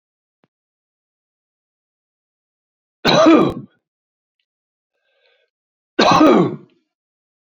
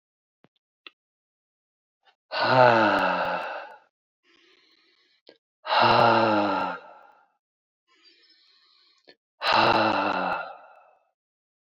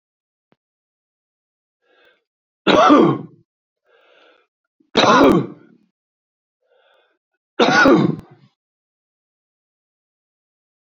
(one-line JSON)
{"cough_length": "7.4 s", "cough_amplitude": 28939, "cough_signal_mean_std_ratio": 0.31, "exhalation_length": "11.7 s", "exhalation_amplitude": 21224, "exhalation_signal_mean_std_ratio": 0.42, "three_cough_length": "10.8 s", "three_cough_amplitude": 30086, "three_cough_signal_mean_std_ratio": 0.31, "survey_phase": "alpha (2021-03-01 to 2021-08-12)", "age": "45-64", "gender": "Male", "wearing_mask": "No", "symptom_cough_any": true, "symptom_change_to_sense_of_smell_or_taste": true, "symptom_loss_of_taste": true, "smoker_status": "Never smoked", "respiratory_condition_asthma": false, "respiratory_condition_other": false, "recruitment_source": "Test and Trace", "submission_delay": "2 days", "covid_test_result": "Positive", "covid_test_method": "RT-qPCR", "covid_ct_value": 22.3, "covid_ct_gene": "ORF1ab gene"}